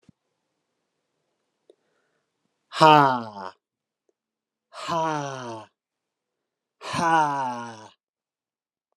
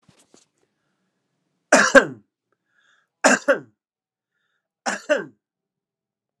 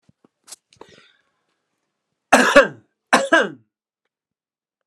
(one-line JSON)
{"exhalation_length": "9.0 s", "exhalation_amplitude": 28944, "exhalation_signal_mean_std_ratio": 0.3, "three_cough_length": "6.4 s", "three_cough_amplitude": 32768, "three_cough_signal_mean_std_ratio": 0.24, "cough_length": "4.9 s", "cough_amplitude": 32768, "cough_signal_mean_std_ratio": 0.26, "survey_phase": "alpha (2021-03-01 to 2021-08-12)", "age": "45-64", "gender": "Male", "wearing_mask": "No", "symptom_none": true, "smoker_status": "Never smoked", "respiratory_condition_asthma": false, "respiratory_condition_other": false, "recruitment_source": "REACT", "submission_delay": "1 day", "covid_test_result": "Negative", "covid_test_method": "RT-qPCR"}